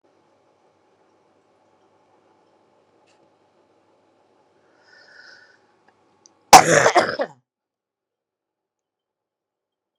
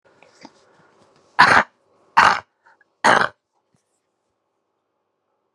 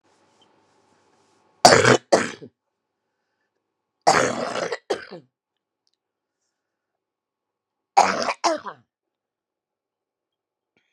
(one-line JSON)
{"cough_length": "10.0 s", "cough_amplitude": 32768, "cough_signal_mean_std_ratio": 0.16, "exhalation_length": "5.5 s", "exhalation_amplitude": 32768, "exhalation_signal_mean_std_ratio": 0.26, "three_cough_length": "10.9 s", "three_cough_amplitude": 32768, "three_cough_signal_mean_std_ratio": 0.26, "survey_phase": "beta (2021-08-13 to 2022-03-07)", "age": "45-64", "gender": "Female", "wearing_mask": "No", "symptom_cough_any": true, "symptom_runny_or_blocked_nose": true, "symptom_sore_throat": true, "symptom_fatigue": true, "symptom_headache": true, "symptom_change_to_sense_of_smell_or_taste": true, "symptom_loss_of_taste": true, "symptom_onset": "4 days", "smoker_status": "Ex-smoker", "respiratory_condition_asthma": true, "respiratory_condition_other": false, "recruitment_source": "Test and Trace", "submission_delay": "2 days", "covid_test_result": "Positive", "covid_test_method": "RT-qPCR"}